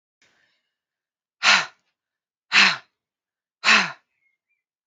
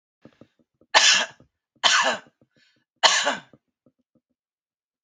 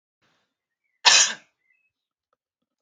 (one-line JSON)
{"exhalation_length": "4.9 s", "exhalation_amplitude": 26958, "exhalation_signal_mean_std_ratio": 0.28, "three_cough_length": "5.0 s", "three_cough_amplitude": 29139, "three_cough_signal_mean_std_ratio": 0.34, "cough_length": "2.8 s", "cough_amplitude": 32767, "cough_signal_mean_std_ratio": 0.23, "survey_phase": "alpha (2021-03-01 to 2021-08-12)", "age": "18-44", "gender": "Female", "wearing_mask": "No", "symptom_none": true, "smoker_status": "Never smoked", "respiratory_condition_asthma": false, "respiratory_condition_other": false, "recruitment_source": "REACT", "submission_delay": "2 days", "covid_test_result": "Negative", "covid_test_method": "RT-qPCR"}